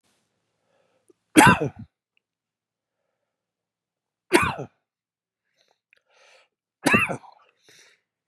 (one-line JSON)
{"three_cough_length": "8.3 s", "three_cough_amplitude": 31662, "three_cough_signal_mean_std_ratio": 0.22, "survey_phase": "beta (2021-08-13 to 2022-03-07)", "age": "45-64", "gender": "Male", "wearing_mask": "No", "symptom_cough_any": true, "symptom_runny_or_blocked_nose": true, "symptom_sore_throat": true, "symptom_headache": true, "symptom_onset": "3 days", "smoker_status": "Never smoked", "respiratory_condition_asthma": false, "respiratory_condition_other": false, "recruitment_source": "Test and Trace", "submission_delay": "1 day", "covid_test_result": "Positive", "covid_test_method": "ePCR"}